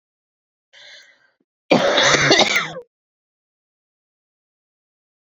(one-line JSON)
{"three_cough_length": "5.2 s", "three_cough_amplitude": 31052, "three_cough_signal_mean_std_ratio": 0.35, "survey_phase": "beta (2021-08-13 to 2022-03-07)", "age": "18-44", "gender": "Female", "wearing_mask": "No", "symptom_cough_any": true, "symptom_runny_or_blocked_nose": true, "symptom_sore_throat": true, "symptom_fatigue": true, "symptom_headache": true, "symptom_change_to_sense_of_smell_or_taste": true, "smoker_status": "Ex-smoker", "respiratory_condition_asthma": false, "respiratory_condition_other": false, "recruitment_source": "Test and Trace", "submission_delay": "2 days", "covid_test_result": "Positive", "covid_test_method": "LFT"}